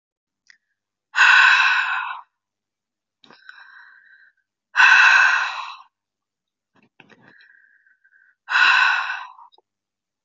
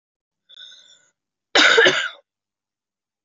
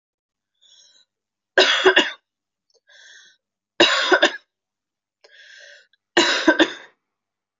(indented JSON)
{
  "exhalation_length": "10.2 s",
  "exhalation_amplitude": 25940,
  "exhalation_signal_mean_std_ratio": 0.39,
  "cough_length": "3.2 s",
  "cough_amplitude": 26629,
  "cough_signal_mean_std_ratio": 0.32,
  "three_cough_length": "7.6 s",
  "three_cough_amplitude": 26598,
  "three_cough_signal_mean_std_ratio": 0.34,
  "survey_phase": "beta (2021-08-13 to 2022-03-07)",
  "age": "18-44",
  "gender": "Female",
  "wearing_mask": "No",
  "symptom_cough_any": true,
  "symptom_new_continuous_cough": true,
  "symptom_runny_or_blocked_nose": true,
  "symptom_sore_throat": true,
  "symptom_fatigue": true,
  "symptom_headache": true,
  "symptom_change_to_sense_of_smell_or_taste": true,
  "symptom_onset": "3 days",
  "smoker_status": "Ex-smoker",
  "respiratory_condition_asthma": false,
  "respiratory_condition_other": false,
  "recruitment_source": "Test and Trace",
  "submission_delay": "2 days",
  "covid_test_result": "Positive",
  "covid_test_method": "RT-qPCR",
  "covid_ct_value": 30.0,
  "covid_ct_gene": "ORF1ab gene",
  "covid_ct_mean": 30.8,
  "covid_viral_load": "77 copies/ml",
  "covid_viral_load_category": "Minimal viral load (< 10K copies/ml)"
}